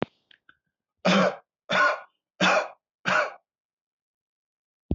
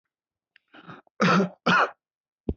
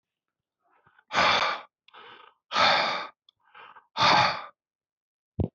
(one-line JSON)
{"three_cough_length": "4.9 s", "three_cough_amplitude": 15309, "three_cough_signal_mean_std_ratio": 0.39, "cough_length": "2.6 s", "cough_amplitude": 11720, "cough_signal_mean_std_ratio": 0.39, "exhalation_length": "5.5 s", "exhalation_amplitude": 17124, "exhalation_signal_mean_std_ratio": 0.42, "survey_phase": "beta (2021-08-13 to 2022-03-07)", "age": "18-44", "gender": "Male", "wearing_mask": "No", "symptom_none": true, "smoker_status": "Never smoked", "respiratory_condition_asthma": false, "respiratory_condition_other": false, "recruitment_source": "REACT", "submission_delay": "2 days", "covid_test_result": "Negative", "covid_test_method": "RT-qPCR"}